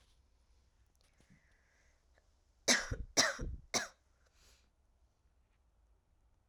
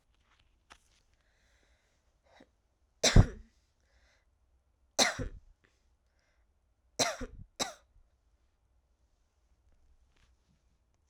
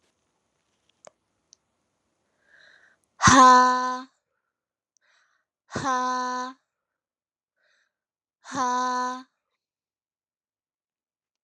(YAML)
cough_length: 6.5 s
cough_amplitude: 6301
cough_signal_mean_std_ratio: 0.26
three_cough_length: 11.1 s
three_cough_amplitude: 15155
three_cough_signal_mean_std_ratio: 0.18
exhalation_length: 11.4 s
exhalation_amplitude: 26125
exhalation_signal_mean_std_ratio: 0.29
survey_phase: alpha (2021-03-01 to 2021-08-12)
age: 18-44
gender: Female
wearing_mask: 'No'
symptom_cough_any: true
symptom_new_continuous_cough: true
symptom_abdominal_pain: true
symptom_fever_high_temperature: true
symptom_headache: true
symptom_change_to_sense_of_smell_or_taste: true
symptom_loss_of_taste: true
symptom_onset: 6 days
smoker_status: Never smoked
respiratory_condition_asthma: false
respiratory_condition_other: false
recruitment_source: Test and Trace
submission_delay: 2 days
covid_test_result: Positive
covid_test_method: RT-qPCR